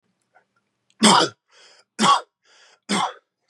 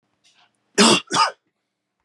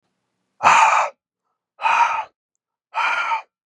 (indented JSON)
{
  "three_cough_length": "3.5 s",
  "three_cough_amplitude": 29202,
  "three_cough_signal_mean_std_ratio": 0.35,
  "cough_length": "2.0 s",
  "cough_amplitude": 31254,
  "cough_signal_mean_std_ratio": 0.35,
  "exhalation_length": "3.7 s",
  "exhalation_amplitude": 32175,
  "exhalation_signal_mean_std_ratio": 0.48,
  "survey_phase": "beta (2021-08-13 to 2022-03-07)",
  "age": "18-44",
  "gender": "Male",
  "wearing_mask": "No",
  "symptom_none": true,
  "smoker_status": "Never smoked",
  "respiratory_condition_asthma": false,
  "respiratory_condition_other": false,
  "recruitment_source": "REACT",
  "submission_delay": "3 days",
  "covid_test_result": "Negative",
  "covid_test_method": "RT-qPCR",
  "influenza_a_test_result": "Negative",
  "influenza_b_test_result": "Negative"
}